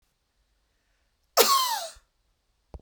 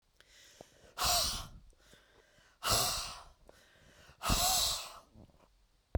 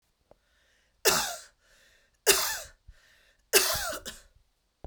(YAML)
cough_length: 2.8 s
cough_amplitude: 24021
cough_signal_mean_std_ratio: 0.31
exhalation_length: 6.0 s
exhalation_amplitude: 5812
exhalation_signal_mean_std_ratio: 0.46
three_cough_length: 4.9 s
three_cough_amplitude: 22723
three_cough_signal_mean_std_ratio: 0.35
survey_phase: beta (2021-08-13 to 2022-03-07)
age: 45-64
gender: Female
wearing_mask: 'No'
symptom_none: true
smoker_status: Never smoked
respiratory_condition_asthma: false
respiratory_condition_other: false
recruitment_source: REACT
submission_delay: 1 day
covid_test_result: Negative
covid_test_method: RT-qPCR